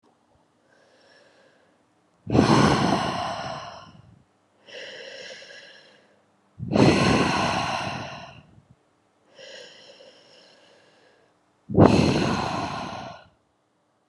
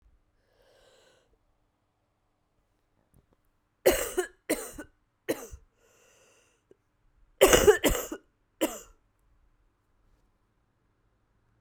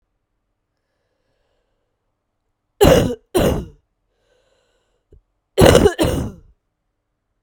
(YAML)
exhalation_length: 14.1 s
exhalation_amplitude: 32361
exhalation_signal_mean_std_ratio: 0.41
three_cough_length: 11.6 s
three_cough_amplitude: 24792
three_cough_signal_mean_std_ratio: 0.23
cough_length: 7.4 s
cough_amplitude: 32768
cough_signal_mean_std_ratio: 0.31
survey_phase: beta (2021-08-13 to 2022-03-07)
age: 18-44
gender: Female
wearing_mask: 'No'
symptom_cough_any: true
symptom_runny_or_blocked_nose: true
symptom_shortness_of_breath: true
symptom_fatigue: true
symptom_change_to_sense_of_smell_or_taste: true
symptom_onset: 5 days
smoker_status: Current smoker (e-cigarettes or vapes only)
respiratory_condition_asthma: true
respiratory_condition_other: false
recruitment_source: Test and Trace
submission_delay: 2 days
covid_test_result: Positive
covid_test_method: RT-qPCR
covid_ct_value: 12.4
covid_ct_gene: ORF1ab gene
covid_ct_mean: 12.8
covid_viral_load: 64000000 copies/ml
covid_viral_load_category: High viral load (>1M copies/ml)